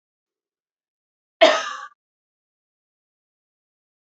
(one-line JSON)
{"cough_length": "4.1 s", "cough_amplitude": 27588, "cough_signal_mean_std_ratio": 0.18, "survey_phase": "beta (2021-08-13 to 2022-03-07)", "age": "18-44", "gender": "Female", "wearing_mask": "No", "symptom_none": true, "smoker_status": "Never smoked", "respiratory_condition_asthma": false, "respiratory_condition_other": false, "recruitment_source": "REACT", "submission_delay": "1 day", "covid_test_result": "Negative", "covid_test_method": "RT-qPCR", "influenza_a_test_result": "Negative", "influenza_b_test_result": "Negative"}